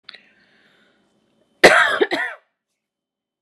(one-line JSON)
{"cough_length": "3.4 s", "cough_amplitude": 32768, "cough_signal_mean_std_ratio": 0.29, "survey_phase": "beta (2021-08-13 to 2022-03-07)", "age": "18-44", "gender": "Female", "wearing_mask": "No", "symptom_none": true, "smoker_status": "Never smoked", "respiratory_condition_asthma": false, "respiratory_condition_other": false, "recruitment_source": "REACT", "submission_delay": "5 days", "covid_test_result": "Negative", "covid_test_method": "RT-qPCR"}